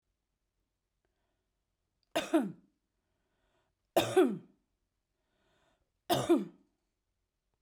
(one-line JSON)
{"three_cough_length": "7.6 s", "three_cough_amplitude": 6406, "three_cough_signal_mean_std_ratio": 0.27, "survey_phase": "beta (2021-08-13 to 2022-03-07)", "age": "45-64", "gender": "Female", "wearing_mask": "No", "symptom_cough_any": true, "symptom_runny_or_blocked_nose": true, "symptom_fatigue": true, "symptom_headache": true, "symptom_change_to_sense_of_smell_or_taste": true, "symptom_loss_of_taste": true, "symptom_other": true, "symptom_onset": "2 days", "smoker_status": "Never smoked", "respiratory_condition_asthma": false, "respiratory_condition_other": false, "recruitment_source": "Test and Trace", "submission_delay": "2 days", "covid_test_result": "Positive", "covid_test_method": "RT-qPCR"}